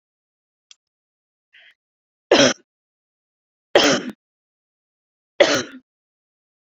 {"three_cough_length": "6.7 s", "three_cough_amplitude": 29072, "three_cough_signal_mean_std_ratio": 0.25, "survey_phase": "beta (2021-08-13 to 2022-03-07)", "age": "18-44", "gender": "Female", "wearing_mask": "No", "symptom_cough_any": true, "smoker_status": "Current smoker (e-cigarettes or vapes only)", "respiratory_condition_asthma": false, "respiratory_condition_other": false, "recruitment_source": "REACT", "submission_delay": "0 days", "covid_test_result": "Negative", "covid_test_method": "RT-qPCR"}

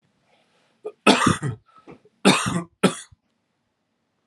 {"three_cough_length": "4.3 s", "three_cough_amplitude": 31703, "three_cough_signal_mean_std_ratio": 0.33, "survey_phase": "alpha (2021-03-01 to 2021-08-12)", "age": "18-44", "gender": "Male", "wearing_mask": "No", "symptom_cough_any": true, "symptom_fatigue": true, "symptom_headache": true, "symptom_onset": "2 days", "smoker_status": "Current smoker (11 or more cigarettes per day)", "respiratory_condition_asthma": false, "respiratory_condition_other": false, "recruitment_source": "Test and Trace", "submission_delay": "1 day", "covid_test_result": "Positive", "covid_test_method": "RT-qPCR", "covid_ct_value": 16.1, "covid_ct_gene": "ORF1ab gene", "covid_ct_mean": 16.5, "covid_viral_load": "3700000 copies/ml", "covid_viral_load_category": "High viral load (>1M copies/ml)"}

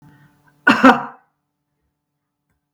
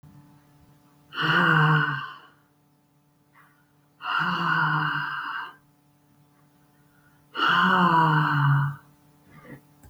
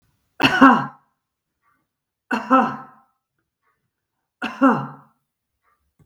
{"cough_length": "2.7 s", "cough_amplitude": 32768, "cough_signal_mean_std_ratio": 0.25, "exhalation_length": "9.9 s", "exhalation_amplitude": 14450, "exhalation_signal_mean_std_ratio": 0.53, "three_cough_length": "6.1 s", "three_cough_amplitude": 32768, "three_cough_signal_mean_std_ratio": 0.3, "survey_phase": "beta (2021-08-13 to 2022-03-07)", "age": "45-64", "gender": "Female", "wearing_mask": "No", "symptom_none": true, "smoker_status": "Never smoked", "respiratory_condition_asthma": false, "respiratory_condition_other": false, "recruitment_source": "REACT", "submission_delay": "2 days", "covid_test_result": "Negative", "covid_test_method": "RT-qPCR", "influenza_a_test_result": "Negative", "influenza_b_test_result": "Negative"}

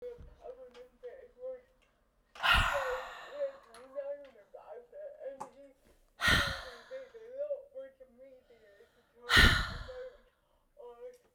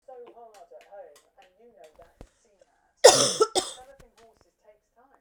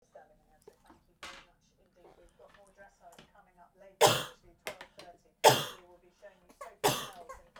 {"exhalation_length": "11.3 s", "exhalation_amplitude": 12417, "exhalation_signal_mean_std_ratio": 0.38, "cough_length": "5.2 s", "cough_amplitude": 32620, "cough_signal_mean_std_ratio": 0.22, "three_cough_length": "7.6 s", "three_cough_amplitude": 15001, "three_cough_signal_mean_std_ratio": 0.24, "survey_phase": "beta (2021-08-13 to 2022-03-07)", "age": "18-44", "gender": "Female", "wearing_mask": "No", "symptom_cough_any": true, "symptom_runny_or_blocked_nose": true, "symptom_sore_throat": true, "symptom_fever_high_temperature": true, "symptom_headache": true, "symptom_change_to_sense_of_smell_or_taste": true, "symptom_loss_of_taste": true, "smoker_status": "Ex-smoker", "respiratory_condition_asthma": false, "respiratory_condition_other": false, "recruitment_source": "Test and Trace", "submission_delay": "2 days", "covid_test_result": "Positive", "covid_test_method": "LFT"}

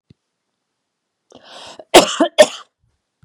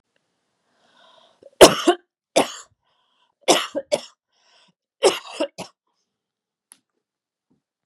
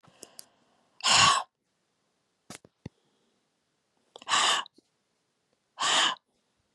{"cough_length": "3.2 s", "cough_amplitude": 32768, "cough_signal_mean_std_ratio": 0.24, "three_cough_length": "7.9 s", "three_cough_amplitude": 32768, "three_cough_signal_mean_std_ratio": 0.22, "exhalation_length": "6.7 s", "exhalation_amplitude": 13902, "exhalation_signal_mean_std_ratio": 0.32, "survey_phase": "beta (2021-08-13 to 2022-03-07)", "age": "45-64", "gender": "Female", "wearing_mask": "No", "symptom_cough_any": true, "symptom_fatigue": true, "symptom_onset": "4 days", "smoker_status": "Prefer not to say", "respiratory_condition_asthma": false, "respiratory_condition_other": false, "recruitment_source": "Test and Trace", "submission_delay": "2 days", "covid_test_result": "Positive", "covid_test_method": "RT-qPCR", "covid_ct_value": 31.2, "covid_ct_gene": "ORF1ab gene", "covid_ct_mean": 32.1, "covid_viral_load": "30 copies/ml", "covid_viral_load_category": "Minimal viral load (< 10K copies/ml)"}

